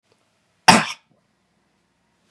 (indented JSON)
{
  "cough_length": "2.3 s",
  "cough_amplitude": 32768,
  "cough_signal_mean_std_ratio": 0.2,
  "survey_phase": "beta (2021-08-13 to 2022-03-07)",
  "age": "45-64",
  "gender": "Male",
  "wearing_mask": "No",
  "symptom_none": true,
  "symptom_onset": "8 days",
  "smoker_status": "Ex-smoker",
  "respiratory_condition_asthma": false,
  "respiratory_condition_other": false,
  "recruitment_source": "REACT",
  "submission_delay": "1 day",
  "covid_test_result": "Negative",
  "covid_test_method": "RT-qPCR",
  "influenza_a_test_result": "Negative",
  "influenza_b_test_result": "Negative"
}